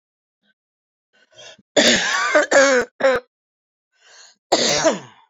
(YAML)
cough_length: 5.3 s
cough_amplitude: 27572
cough_signal_mean_std_ratio: 0.47
survey_phase: beta (2021-08-13 to 2022-03-07)
age: 45-64
gender: Female
wearing_mask: 'No'
symptom_cough_any: true
symptom_new_continuous_cough: true
symptom_shortness_of_breath: true
symptom_diarrhoea: true
symptom_fatigue: true
symptom_headache: true
symptom_change_to_sense_of_smell_or_taste: true
symptom_onset: 5 days
smoker_status: Never smoked
respiratory_condition_asthma: false
respiratory_condition_other: true
recruitment_source: Test and Trace
submission_delay: 1 day
covid_test_result: Positive
covid_test_method: RT-qPCR
covid_ct_value: 35.9
covid_ct_gene: N gene
covid_ct_mean: 36.4
covid_viral_load: 1.1 copies/ml
covid_viral_load_category: Minimal viral load (< 10K copies/ml)